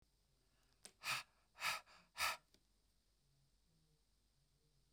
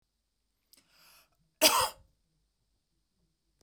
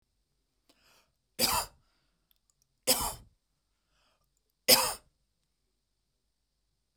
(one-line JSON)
{"exhalation_length": "4.9 s", "exhalation_amplitude": 1392, "exhalation_signal_mean_std_ratio": 0.3, "cough_length": "3.6 s", "cough_amplitude": 14795, "cough_signal_mean_std_ratio": 0.21, "three_cough_length": "7.0 s", "three_cough_amplitude": 17525, "three_cough_signal_mean_std_ratio": 0.23, "survey_phase": "beta (2021-08-13 to 2022-03-07)", "age": "45-64", "gender": "Female", "wearing_mask": "No", "symptom_none": true, "smoker_status": "Ex-smoker", "respiratory_condition_asthma": false, "respiratory_condition_other": false, "recruitment_source": "REACT", "submission_delay": "1 day", "covid_test_result": "Negative", "covid_test_method": "RT-qPCR"}